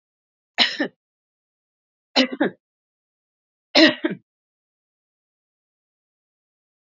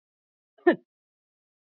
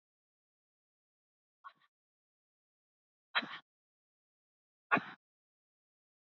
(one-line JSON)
{"three_cough_length": "6.8 s", "three_cough_amplitude": 29714, "three_cough_signal_mean_std_ratio": 0.23, "cough_length": "1.8 s", "cough_amplitude": 15071, "cough_signal_mean_std_ratio": 0.16, "exhalation_length": "6.2 s", "exhalation_amplitude": 6441, "exhalation_signal_mean_std_ratio": 0.14, "survey_phase": "beta (2021-08-13 to 2022-03-07)", "age": "45-64", "gender": "Female", "wearing_mask": "No", "symptom_none": true, "smoker_status": "Never smoked", "respiratory_condition_asthma": false, "respiratory_condition_other": false, "recruitment_source": "REACT", "submission_delay": "1 day", "covid_test_result": "Negative", "covid_test_method": "RT-qPCR", "influenza_a_test_result": "Negative", "influenza_b_test_result": "Negative"}